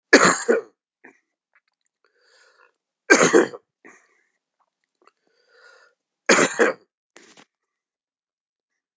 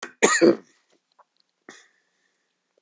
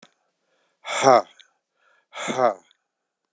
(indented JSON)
{
  "three_cough_length": "9.0 s",
  "three_cough_amplitude": 32768,
  "three_cough_signal_mean_std_ratio": 0.27,
  "cough_length": "2.8 s",
  "cough_amplitude": 23730,
  "cough_signal_mean_std_ratio": 0.26,
  "exhalation_length": "3.3 s",
  "exhalation_amplitude": 27431,
  "exhalation_signal_mean_std_ratio": 0.29,
  "survey_phase": "beta (2021-08-13 to 2022-03-07)",
  "age": "65+",
  "gender": "Male",
  "wearing_mask": "No",
  "symptom_cough_any": true,
  "symptom_runny_or_blocked_nose": true,
  "symptom_fatigue": true,
  "symptom_headache": true,
  "symptom_change_to_sense_of_smell_or_taste": true,
  "symptom_onset": "10 days",
  "smoker_status": "Never smoked",
  "respiratory_condition_asthma": false,
  "respiratory_condition_other": false,
  "recruitment_source": "Test and Trace",
  "submission_delay": "1 day",
  "covid_test_result": "Positive",
  "covid_test_method": "RT-qPCR",
  "covid_ct_value": 31.5,
  "covid_ct_gene": "ORF1ab gene"
}